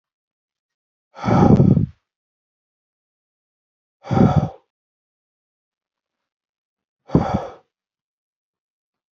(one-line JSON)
{"exhalation_length": "9.1 s", "exhalation_amplitude": 30444, "exhalation_signal_mean_std_ratio": 0.28, "survey_phase": "beta (2021-08-13 to 2022-03-07)", "age": "45-64", "gender": "Male", "wearing_mask": "No", "symptom_runny_or_blocked_nose": true, "smoker_status": "Never smoked", "respiratory_condition_asthma": false, "respiratory_condition_other": false, "recruitment_source": "REACT", "submission_delay": "5 days", "covid_test_result": "Negative", "covid_test_method": "RT-qPCR"}